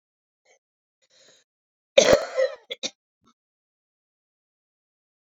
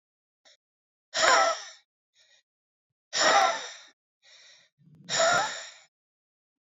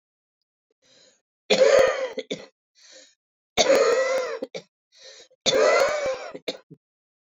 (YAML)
cough_length: 5.4 s
cough_amplitude: 28613
cough_signal_mean_std_ratio: 0.21
exhalation_length: 6.7 s
exhalation_amplitude: 17266
exhalation_signal_mean_std_ratio: 0.37
three_cough_length: 7.3 s
three_cough_amplitude: 20647
three_cough_signal_mean_std_ratio: 0.46
survey_phase: beta (2021-08-13 to 2022-03-07)
age: 65+
gender: Female
wearing_mask: 'No'
symptom_cough_any: true
smoker_status: Never smoked
respiratory_condition_asthma: false
respiratory_condition_other: true
recruitment_source: REACT
submission_delay: 1 day
covid_test_result: Negative
covid_test_method: RT-qPCR